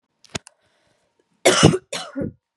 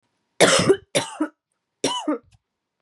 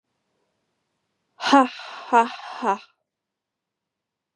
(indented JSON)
{
  "cough_length": "2.6 s",
  "cough_amplitude": 32768,
  "cough_signal_mean_std_ratio": 0.32,
  "three_cough_length": "2.8 s",
  "three_cough_amplitude": 29468,
  "three_cough_signal_mean_std_ratio": 0.41,
  "exhalation_length": "4.4 s",
  "exhalation_amplitude": 26058,
  "exhalation_signal_mean_std_ratio": 0.28,
  "survey_phase": "beta (2021-08-13 to 2022-03-07)",
  "age": "18-44",
  "gender": "Female",
  "wearing_mask": "No",
  "symptom_cough_any": true,
  "symptom_runny_or_blocked_nose": true,
  "symptom_abdominal_pain": true,
  "symptom_fatigue": true,
  "symptom_change_to_sense_of_smell_or_taste": true,
  "symptom_loss_of_taste": true,
  "symptom_onset": "3 days",
  "smoker_status": "Ex-smoker",
  "respiratory_condition_asthma": false,
  "respiratory_condition_other": false,
  "recruitment_source": "Test and Trace",
  "submission_delay": "2 days",
  "covid_test_result": "Positive",
  "covid_test_method": "RT-qPCR",
  "covid_ct_value": 19.3,
  "covid_ct_gene": "ORF1ab gene",
  "covid_ct_mean": 19.6,
  "covid_viral_load": "370000 copies/ml",
  "covid_viral_load_category": "Low viral load (10K-1M copies/ml)"
}